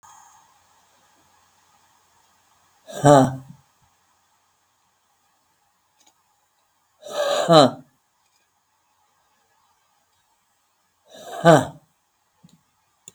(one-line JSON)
{"exhalation_length": "13.1 s", "exhalation_amplitude": 32768, "exhalation_signal_mean_std_ratio": 0.21, "survey_phase": "beta (2021-08-13 to 2022-03-07)", "age": "45-64", "gender": "Female", "wearing_mask": "No", "symptom_none": true, "smoker_status": "Current smoker (11 or more cigarettes per day)", "respiratory_condition_asthma": false, "respiratory_condition_other": false, "recruitment_source": "REACT", "submission_delay": "1 day", "covid_test_result": "Negative", "covid_test_method": "RT-qPCR", "influenza_a_test_result": "Negative", "influenza_b_test_result": "Negative"}